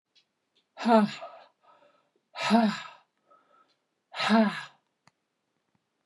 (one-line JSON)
{"exhalation_length": "6.1 s", "exhalation_amplitude": 15136, "exhalation_signal_mean_std_ratio": 0.33, "survey_phase": "beta (2021-08-13 to 2022-03-07)", "age": "45-64", "gender": "Female", "wearing_mask": "No", "symptom_none": true, "smoker_status": "Never smoked", "respiratory_condition_asthma": false, "respiratory_condition_other": false, "recruitment_source": "REACT", "submission_delay": "0 days", "covid_test_result": "Negative", "covid_test_method": "RT-qPCR", "influenza_a_test_result": "Negative", "influenza_b_test_result": "Negative"}